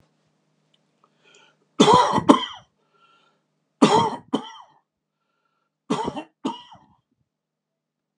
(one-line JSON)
{"three_cough_length": "8.2 s", "three_cough_amplitude": 32767, "three_cough_signal_mean_std_ratio": 0.29, "survey_phase": "beta (2021-08-13 to 2022-03-07)", "age": "65+", "gender": "Male", "wearing_mask": "No", "symptom_none": true, "smoker_status": "Ex-smoker", "respiratory_condition_asthma": false, "respiratory_condition_other": false, "recruitment_source": "REACT", "submission_delay": "1 day", "covid_test_result": "Negative", "covid_test_method": "RT-qPCR"}